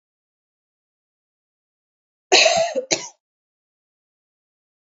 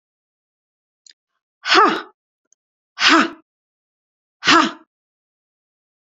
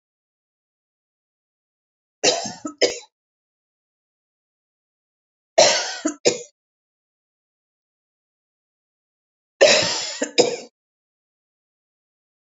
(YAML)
cough_length: 4.9 s
cough_amplitude: 31029
cough_signal_mean_std_ratio: 0.25
exhalation_length: 6.1 s
exhalation_amplitude: 30155
exhalation_signal_mean_std_ratio: 0.29
three_cough_length: 12.5 s
three_cough_amplitude: 28366
three_cough_signal_mean_std_ratio: 0.26
survey_phase: beta (2021-08-13 to 2022-03-07)
age: 45-64
gender: Female
wearing_mask: 'No'
symptom_headache: true
smoker_status: Never smoked
respiratory_condition_asthma: false
respiratory_condition_other: false
recruitment_source: REACT
submission_delay: 5 days
covid_test_result: Negative
covid_test_method: RT-qPCR
influenza_a_test_result: Negative
influenza_b_test_result: Negative